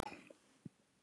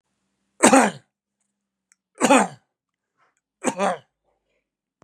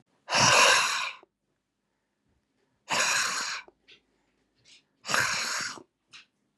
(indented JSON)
{
  "cough_length": "1.0 s",
  "cough_amplitude": 3183,
  "cough_signal_mean_std_ratio": 0.3,
  "three_cough_length": "5.0 s",
  "three_cough_amplitude": 32767,
  "three_cough_signal_mean_std_ratio": 0.28,
  "exhalation_length": "6.6 s",
  "exhalation_amplitude": 14329,
  "exhalation_signal_mean_std_ratio": 0.44,
  "survey_phase": "beta (2021-08-13 to 2022-03-07)",
  "age": "45-64",
  "gender": "Male",
  "wearing_mask": "Yes",
  "symptom_none": true,
  "smoker_status": "Never smoked",
  "respiratory_condition_asthma": false,
  "respiratory_condition_other": false,
  "recruitment_source": "REACT",
  "submission_delay": "2 days",
  "covid_test_result": "Negative",
  "covid_test_method": "RT-qPCR",
  "influenza_a_test_result": "Negative",
  "influenza_b_test_result": "Negative"
}